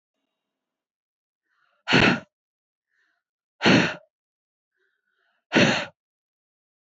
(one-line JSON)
{"exhalation_length": "6.9 s", "exhalation_amplitude": 21146, "exhalation_signal_mean_std_ratio": 0.28, "survey_phase": "beta (2021-08-13 to 2022-03-07)", "age": "45-64", "gender": "Female", "wearing_mask": "No", "symptom_none": true, "smoker_status": "Never smoked", "respiratory_condition_asthma": false, "respiratory_condition_other": false, "recruitment_source": "REACT", "submission_delay": "4 days", "covid_test_result": "Negative", "covid_test_method": "RT-qPCR", "influenza_a_test_result": "Negative", "influenza_b_test_result": "Negative"}